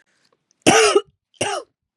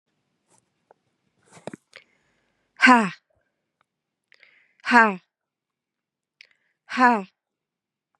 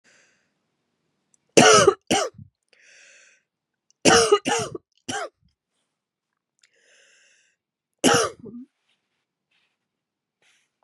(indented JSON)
{
  "cough_length": "2.0 s",
  "cough_amplitude": 32197,
  "cough_signal_mean_std_ratio": 0.39,
  "exhalation_length": "8.2 s",
  "exhalation_amplitude": 30942,
  "exhalation_signal_mean_std_ratio": 0.23,
  "three_cough_length": "10.8 s",
  "three_cough_amplitude": 32600,
  "three_cough_signal_mean_std_ratio": 0.27,
  "survey_phase": "beta (2021-08-13 to 2022-03-07)",
  "age": "45-64",
  "gender": "Female",
  "wearing_mask": "No",
  "symptom_cough_any": true,
  "symptom_runny_or_blocked_nose": true,
  "symptom_shortness_of_breath": true,
  "symptom_change_to_sense_of_smell_or_taste": true,
  "smoker_status": "Never smoked",
  "respiratory_condition_asthma": true,
  "respiratory_condition_other": false,
  "recruitment_source": "Test and Trace",
  "submission_delay": "1 day",
  "covid_test_result": "Positive",
  "covid_test_method": "RT-qPCR",
  "covid_ct_value": 23.6,
  "covid_ct_gene": "ORF1ab gene",
  "covid_ct_mean": 23.9,
  "covid_viral_load": "14000 copies/ml",
  "covid_viral_load_category": "Low viral load (10K-1M copies/ml)"
}